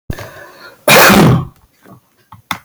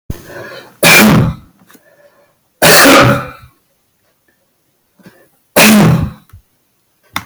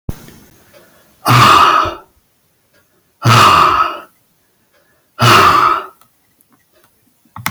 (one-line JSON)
{"cough_length": "2.6 s", "cough_amplitude": 32768, "cough_signal_mean_std_ratio": 0.47, "three_cough_length": "7.3 s", "three_cough_amplitude": 32768, "three_cough_signal_mean_std_ratio": 0.47, "exhalation_length": "7.5 s", "exhalation_amplitude": 32768, "exhalation_signal_mean_std_ratio": 0.46, "survey_phase": "beta (2021-08-13 to 2022-03-07)", "age": "65+", "gender": "Male", "wearing_mask": "No", "symptom_none": true, "smoker_status": "Ex-smoker", "respiratory_condition_asthma": false, "respiratory_condition_other": false, "recruitment_source": "REACT", "submission_delay": "2 days", "covid_test_result": "Negative", "covid_test_method": "RT-qPCR"}